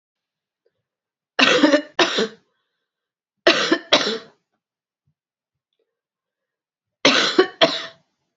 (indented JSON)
{
  "cough_length": "8.4 s",
  "cough_amplitude": 30252,
  "cough_signal_mean_std_ratio": 0.35,
  "survey_phase": "beta (2021-08-13 to 2022-03-07)",
  "age": "45-64",
  "gender": "Female",
  "wearing_mask": "No",
  "symptom_cough_any": true,
  "symptom_fatigue": true,
  "symptom_fever_high_temperature": true,
  "symptom_headache": true,
  "symptom_other": true,
  "smoker_status": "Never smoked",
  "respiratory_condition_asthma": false,
  "respiratory_condition_other": false,
  "recruitment_source": "Test and Trace",
  "submission_delay": "2 days",
  "covid_test_result": "Positive",
  "covid_test_method": "LFT"
}